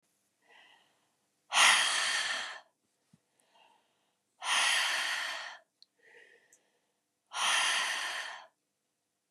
exhalation_length: 9.3 s
exhalation_amplitude: 10799
exhalation_signal_mean_std_ratio: 0.44
survey_phase: beta (2021-08-13 to 2022-03-07)
age: 18-44
gender: Female
wearing_mask: 'No'
symptom_cough_any: true
symptom_runny_or_blocked_nose: true
symptom_sore_throat: true
symptom_diarrhoea: true
symptom_fatigue: true
symptom_change_to_sense_of_smell_or_taste: true
symptom_loss_of_taste: true
smoker_status: Ex-smoker
respiratory_condition_asthma: false
respiratory_condition_other: false
recruitment_source: Test and Trace
submission_delay: 2 days
covid_test_result: Positive
covid_test_method: ePCR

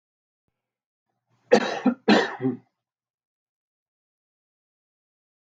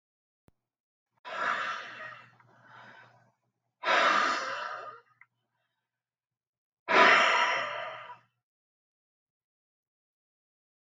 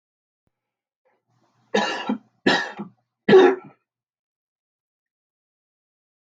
cough_length: 5.5 s
cough_amplitude: 22692
cough_signal_mean_std_ratio: 0.25
exhalation_length: 10.8 s
exhalation_amplitude: 15980
exhalation_signal_mean_std_ratio: 0.35
three_cough_length: 6.4 s
three_cough_amplitude: 23601
three_cough_signal_mean_std_ratio: 0.26
survey_phase: alpha (2021-03-01 to 2021-08-12)
age: 45-64
gender: Male
wearing_mask: 'No'
symptom_none: true
smoker_status: Ex-smoker
respiratory_condition_asthma: false
respiratory_condition_other: false
recruitment_source: REACT
submission_delay: 1 day
covid_test_result: Negative
covid_test_method: RT-qPCR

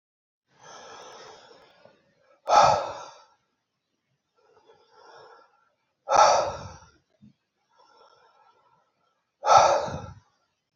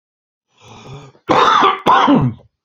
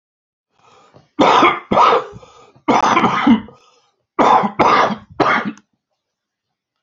exhalation_length: 10.8 s
exhalation_amplitude: 22469
exhalation_signal_mean_std_ratio: 0.29
cough_length: 2.6 s
cough_amplitude: 32767
cough_signal_mean_std_ratio: 0.55
three_cough_length: 6.8 s
three_cough_amplitude: 29630
three_cough_signal_mean_std_ratio: 0.51
survey_phase: beta (2021-08-13 to 2022-03-07)
age: 45-64
gender: Male
wearing_mask: 'No'
symptom_cough_any: true
symptom_runny_or_blocked_nose: true
smoker_status: Never smoked
respiratory_condition_asthma: true
respiratory_condition_other: false
recruitment_source: Test and Trace
submission_delay: 1 day
covid_test_result: Positive
covid_test_method: RT-qPCR
covid_ct_value: 22.0
covid_ct_gene: ORF1ab gene
covid_ct_mean: 22.5
covid_viral_load: 40000 copies/ml
covid_viral_load_category: Low viral load (10K-1M copies/ml)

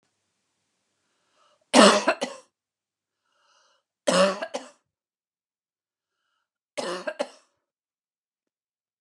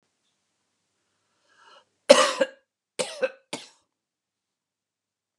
three_cough_length: 9.0 s
three_cough_amplitude: 32262
three_cough_signal_mean_std_ratio: 0.23
cough_length: 5.4 s
cough_amplitude: 32767
cough_signal_mean_std_ratio: 0.19
survey_phase: beta (2021-08-13 to 2022-03-07)
age: 45-64
gender: Female
wearing_mask: 'No'
symptom_none: true
symptom_onset: 13 days
smoker_status: Never smoked
respiratory_condition_asthma: true
respiratory_condition_other: false
recruitment_source: REACT
submission_delay: 3 days
covid_test_result: Negative
covid_test_method: RT-qPCR
influenza_a_test_result: Negative
influenza_b_test_result: Negative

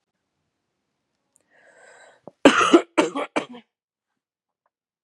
three_cough_length: 5.0 s
three_cough_amplitude: 32638
three_cough_signal_mean_std_ratio: 0.24
survey_phase: beta (2021-08-13 to 2022-03-07)
age: 18-44
gender: Female
wearing_mask: 'No'
symptom_sore_throat: true
symptom_fatigue: true
symptom_headache: true
symptom_onset: 3 days
smoker_status: Never smoked
respiratory_condition_asthma: false
respiratory_condition_other: false
recruitment_source: Test and Trace
submission_delay: 1 day
covid_test_result: Positive
covid_test_method: RT-qPCR
covid_ct_value: 17.2
covid_ct_gene: ORF1ab gene
covid_ct_mean: 17.3
covid_viral_load: 2200000 copies/ml
covid_viral_load_category: High viral load (>1M copies/ml)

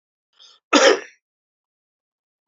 cough_length: 2.5 s
cough_amplitude: 29946
cough_signal_mean_std_ratio: 0.25
survey_phase: alpha (2021-03-01 to 2021-08-12)
age: 45-64
gender: Male
wearing_mask: 'No'
symptom_cough_any: true
symptom_onset: 5 days
smoker_status: Never smoked
respiratory_condition_asthma: false
respiratory_condition_other: false
recruitment_source: Test and Trace
submission_delay: 1 day
covid_test_result: Positive
covid_test_method: RT-qPCR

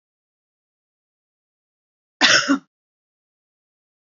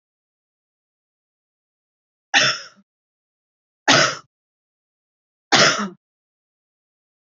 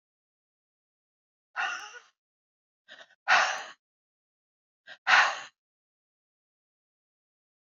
cough_length: 4.2 s
cough_amplitude: 27440
cough_signal_mean_std_ratio: 0.22
three_cough_length: 7.3 s
three_cough_amplitude: 32768
three_cough_signal_mean_std_ratio: 0.26
exhalation_length: 7.8 s
exhalation_amplitude: 14524
exhalation_signal_mean_std_ratio: 0.24
survey_phase: beta (2021-08-13 to 2022-03-07)
age: 45-64
gender: Female
wearing_mask: 'No'
symptom_runny_or_blocked_nose: true
smoker_status: Never smoked
respiratory_condition_asthma: false
respiratory_condition_other: false
recruitment_source: REACT
submission_delay: 2 days
covid_test_result: Negative
covid_test_method: RT-qPCR
influenza_a_test_result: Negative
influenza_b_test_result: Negative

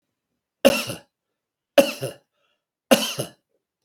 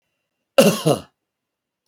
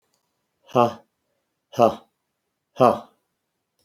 three_cough_length: 3.8 s
three_cough_amplitude: 32768
three_cough_signal_mean_std_ratio: 0.27
cough_length: 1.9 s
cough_amplitude: 28365
cough_signal_mean_std_ratio: 0.31
exhalation_length: 3.8 s
exhalation_amplitude: 28193
exhalation_signal_mean_std_ratio: 0.25
survey_phase: beta (2021-08-13 to 2022-03-07)
age: 65+
gender: Male
wearing_mask: 'No'
symptom_none: true
smoker_status: Never smoked
respiratory_condition_asthma: false
respiratory_condition_other: false
recruitment_source: REACT
submission_delay: 1 day
covid_test_result: Negative
covid_test_method: RT-qPCR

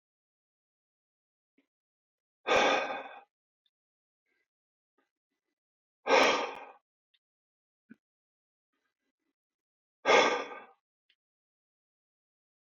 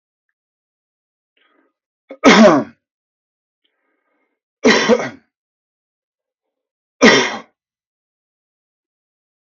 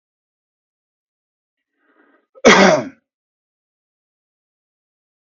exhalation_length: 12.7 s
exhalation_amplitude: 10751
exhalation_signal_mean_std_ratio: 0.25
three_cough_length: 9.6 s
three_cough_amplitude: 32768
three_cough_signal_mean_std_ratio: 0.26
cough_length: 5.4 s
cough_amplitude: 32768
cough_signal_mean_std_ratio: 0.21
survey_phase: beta (2021-08-13 to 2022-03-07)
age: 18-44
gender: Male
wearing_mask: 'No'
symptom_none: true
smoker_status: Never smoked
respiratory_condition_asthma: false
respiratory_condition_other: false
recruitment_source: REACT
submission_delay: 3 days
covid_test_result: Negative
covid_test_method: RT-qPCR
influenza_a_test_result: Negative
influenza_b_test_result: Negative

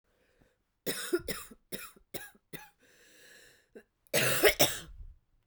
cough_length: 5.5 s
cough_amplitude: 12162
cough_signal_mean_std_ratio: 0.34
survey_phase: beta (2021-08-13 to 2022-03-07)
age: 45-64
gender: Female
wearing_mask: 'No'
symptom_cough_any: true
symptom_new_continuous_cough: true
symptom_runny_or_blocked_nose: true
symptom_shortness_of_breath: true
symptom_sore_throat: true
symptom_fatigue: true
symptom_fever_high_temperature: true
symptom_headache: true
symptom_change_to_sense_of_smell_or_taste: true
symptom_onset: 3 days
smoker_status: Ex-smoker
respiratory_condition_asthma: true
respiratory_condition_other: false
recruitment_source: Test and Trace
submission_delay: 2 days
covid_test_result: Positive
covid_test_method: RT-qPCR
covid_ct_value: 21.2
covid_ct_gene: ORF1ab gene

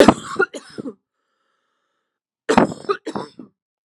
cough_length: 3.8 s
cough_amplitude: 32768
cough_signal_mean_std_ratio: 0.29
survey_phase: alpha (2021-03-01 to 2021-08-12)
age: 45-64
gender: Female
wearing_mask: 'No'
symptom_none: true
smoker_status: Never smoked
respiratory_condition_asthma: false
respiratory_condition_other: false
recruitment_source: REACT
submission_delay: 1 day
covid_test_result: Negative
covid_test_method: RT-qPCR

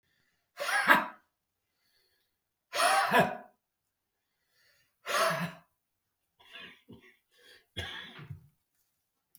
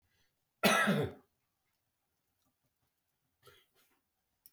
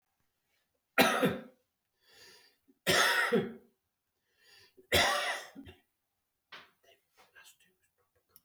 exhalation_length: 9.4 s
exhalation_amplitude: 16425
exhalation_signal_mean_std_ratio: 0.32
cough_length: 4.5 s
cough_amplitude: 6588
cough_signal_mean_std_ratio: 0.26
three_cough_length: 8.4 s
three_cough_amplitude: 10473
three_cough_signal_mean_std_ratio: 0.35
survey_phase: alpha (2021-03-01 to 2021-08-12)
age: 65+
gender: Male
wearing_mask: 'No'
symptom_prefer_not_to_say: true
smoker_status: Ex-smoker
respiratory_condition_asthma: true
respiratory_condition_other: false
recruitment_source: REACT
submission_delay: 6 days
covid_test_result: Negative
covid_test_method: RT-qPCR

